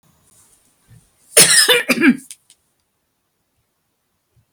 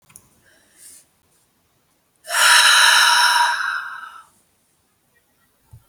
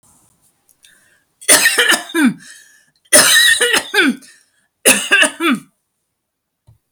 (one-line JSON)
{"cough_length": "4.5 s", "cough_amplitude": 32768, "cough_signal_mean_std_ratio": 0.31, "exhalation_length": "5.9 s", "exhalation_amplitude": 32679, "exhalation_signal_mean_std_ratio": 0.43, "three_cough_length": "6.9 s", "three_cough_amplitude": 32768, "three_cough_signal_mean_std_ratio": 0.47, "survey_phase": "beta (2021-08-13 to 2022-03-07)", "age": "45-64", "gender": "Female", "wearing_mask": "No", "symptom_none": true, "smoker_status": "Ex-smoker", "respiratory_condition_asthma": false, "respiratory_condition_other": false, "recruitment_source": "REACT", "submission_delay": "3 days", "covid_test_result": "Negative", "covid_test_method": "RT-qPCR"}